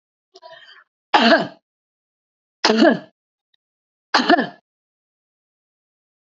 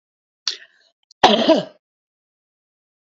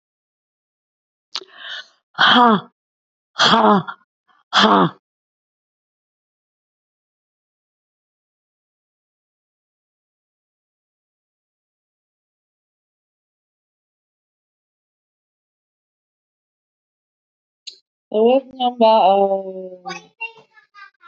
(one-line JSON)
{"three_cough_length": "6.4 s", "three_cough_amplitude": 28868, "three_cough_signal_mean_std_ratio": 0.3, "cough_length": "3.1 s", "cough_amplitude": 32768, "cough_signal_mean_std_ratio": 0.28, "exhalation_length": "21.1 s", "exhalation_amplitude": 28341, "exhalation_signal_mean_std_ratio": 0.27, "survey_phase": "alpha (2021-03-01 to 2021-08-12)", "age": "45-64", "gender": "Female", "wearing_mask": "No", "symptom_cough_any": true, "symptom_fatigue": true, "symptom_onset": "12 days", "smoker_status": "Current smoker (11 or more cigarettes per day)", "respiratory_condition_asthma": false, "respiratory_condition_other": false, "recruitment_source": "REACT", "submission_delay": "3 days", "covid_test_result": "Negative", "covid_test_method": "RT-qPCR"}